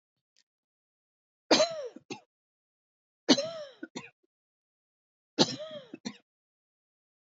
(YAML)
three_cough_length: 7.3 s
three_cough_amplitude: 16395
three_cough_signal_mean_std_ratio: 0.24
survey_phase: beta (2021-08-13 to 2022-03-07)
age: 45-64
gender: Female
wearing_mask: 'No'
symptom_cough_any: true
symptom_runny_or_blocked_nose: true
symptom_sore_throat: true
symptom_fatigue: true
symptom_onset: 5 days
smoker_status: Never smoked
respiratory_condition_asthma: false
respiratory_condition_other: false
recruitment_source: Test and Trace
submission_delay: 1 day
covid_test_result: Negative
covid_test_method: RT-qPCR